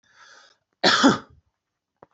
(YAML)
cough_length: 2.1 s
cough_amplitude: 22392
cough_signal_mean_std_ratio: 0.32
survey_phase: beta (2021-08-13 to 2022-03-07)
age: 45-64
gender: Male
wearing_mask: 'No'
symptom_none: true
smoker_status: Never smoked
respiratory_condition_asthma: false
respiratory_condition_other: false
recruitment_source: REACT
submission_delay: 1 day
covid_test_result: Negative
covid_test_method: RT-qPCR